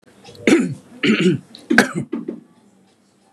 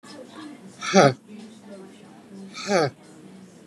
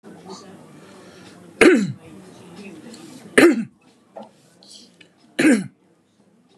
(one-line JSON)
{"cough_length": "3.3 s", "cough_amplitude": 32768, "cough_signal_mean_std_ratio": 0.45, "exhalation_length": "3.7 s", "exhalation_amplitude": 27289, "exhalation_signal_mean_std_ratio": 0.35, "three_cough_length": "6.6 s", "three_cough_amplitude": 32768, "three_cough_signal_mean_std_ratio": 0.32, "survey_phase": "beta (2021-08-13 to 2022-03-07)", "age": "45-64", "gender": "Male", "wearing_mask": "No", "symptom_fatigue": true, "symptom_onset": "4 days", "smoker_status": "Ex-smoker", "respiratory_condition_asthma": false, "respiratory_condition_other": false, "recruitment_source": "REACT", "submission_delay": "1 day", "covid_test_result": "Negative", "covid_test_method": "RT-qPCR", "influenza_a_test_result": "Negative", "influenza_b_test_result": "Negative"}